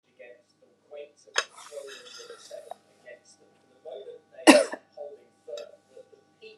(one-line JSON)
{"cough_length": "6.6 s", "cough_amplitude": 32749, "cough_signal_mean_std_ratio": 0.21, "survey_phase": "beta (2021-08-13 to 2022-03-07)", "age": "45-64", "gender": "Female", "wearing_mask": "No", "symptom_none": true, "smoker_status": "Never smoked", "respiratory_condition_asthma": false, "respiratory_condition_other": false, "recruitment_source": "REACT", "submission_delay": "0 days", "covid_test_result": "Negative", "covid_test_method": "RT-qPCR", "influenza_a_test_result": "Negative", "influenza_b_test_result": "Negative"}